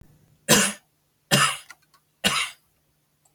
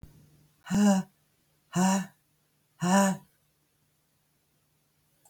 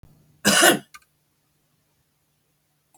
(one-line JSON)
{"three_cough_length": "3.3 s", "three_cough_amplitude": 28755, "three_cough_signal_mean_std_ratio": 0.36, "exhalation_length": "5.3 s", "exhalation_amplitude": 9797, "exhalation_signal_mean_std_ratio": 0.37, "cough_length": "3.0 s", "cough_amplitude": 27983, "cough_signal_mean_std_ratio": 0.27, "survey_phase": "beta (2021-08-13 to 2022-03-07)", "age": "65+", "gender": "Female", "wearing_mask": "No", "symptom_none": true, "smoker_status": "Current smoker (11 or more cigarettes per day)", "respiratory_condition_asthma": false, "respiratory_condition_other": true, "recruitment_source": "REACT", "submission_delay": "2 days", "covid_test_result": "Negative", "covid_test_method": "RT-qPCR"}